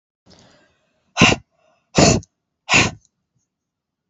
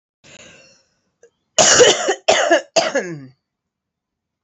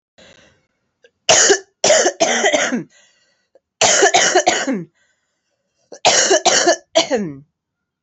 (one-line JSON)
{"exhalation_length": "4.1 s", "exhalation_amplitude": 32768, "exhalation_signal_mean_std_ratio": 0.31, "cough_length": "4.4 s", "cough_amplitude": 32768, "cough_signal_mean_std_ratio": 0.4, "three_cough_length": "8.0 s", "three_cough_amplitude": 32767, "three_cough_signal_mean_std_ratio": 0.52, "survey_phase": "alpha (2021-03-01 to 2021-08-12)", "age": "18-44", "gender": "Female", "wearing_mask": "No", "symptom_change_to_sense_of_smell_or_taste": true, "symptom_onset": "4 days", "smoker_status": "Never smoked", "respiratory_condition_asthma": false, "respiratory_condition_other": false, "recruitment_source": "Test and Trace", "submission_delay": "2 days", "covid_test_result": "Positive", "covid_test_method": "RT-qPCR", "covid_ct_value": 14.7, "covid_ct_gene": "N gene", "covid_ct_mean": 15.7, "covid_viral_load": "6800000 copies/ml", "covid_viral_load_category": "High viral load (>1M copies/ml)"}